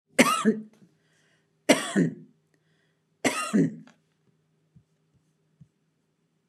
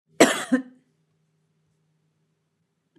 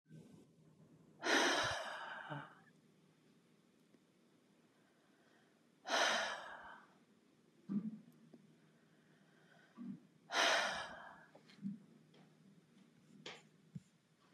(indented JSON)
{
  "three_cough_length": "6.5 s",
  "three_cough_amplitude": 21201,
  "three_cough_signal_mean_std_ratio": 0.31,
  "cough_length": "3.0 s",
  "cough_amplitude": 32157,
  "cough_signal_mean_std_ratio": 0.22,
  "exhalation_length": "14.3 s",
  "exhalation_amplitude": 3210,
  "exhalation_signal_mean_std_ratio": 0.38,
  "survey_phase": "beta (2021-08-13 to 2022-03-07)",
  "age": "65+",
  "gender": "Female",
  "wearing_mask": "No",
  "symptom_none": true,
  "smoker_status": "Ex-smoker",
  "respiratory_condition_asthma": false,
  "respiratory_condition_other": false,
  "recruitment_source": "REACT",
  "submission_delay": "1 day",
  "covid_test_result": "Negative",
  "covid_test_method": "RT-qPCR",
  "influenza_a_test_result": "Negative",
  "influenza_b_test_result": "Negative"
}